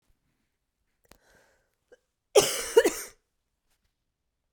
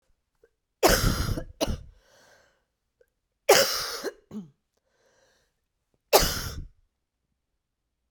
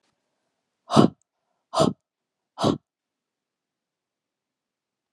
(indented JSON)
{
  "cough_length": "4.5 s",
  "cough_amplitude": 21023,
  "cough_signal_mean_std_ratio": 0.22,
  "three_cough_length": "8.1 s",
  "three_cough_amplitude": 25507,
  "three_cough_signal_mean_std_ratio": 0.32,
  "exhalation_length": "5.1 s",
  "exhalation_amplitude": 28245,
  "exhalation_signal_mean_std_ratio": 0.21,
  "survey_phase": "beta (2021-08-13 to 2022-03-07)",
  "age": "45-64",
  "gender": "Female",
  "wearing_mask": "No",
  "symptom_cough_any": true,
  "symptom_runny_or_blocked_nose": true,
  "symptom_shortness_of_breath": true,
  "symptom_sore_throat": true,
  "symptom_fatigue": true,
  "symptom_headache": true,
  "symptom_change_to_sense_of_smell_or_taste": true,
  "symptom_loss_of_taste": true,
  "symptom_onset": "4 days",
  "smoker_status": "Never smoked",
  "respiratory_condition_asthma": true,
  "respiratory_condition_other": false,
  "recruitment_source": "Test and Trace",
  "submission_delay": "2 days",
  "covid_test_result": "Positive",
  "covid_test_method": "RT-qPCR",
  "covid_ct_value": 10.9,
  "covid_ct_gene": "ORF1ab gene",
  "covid_ct_mean": 11.8,
  "covid_viral_load": "140000000 copies/ml",
  "covid_viral_load_category": "High viral load (>1M copies/ml)"
}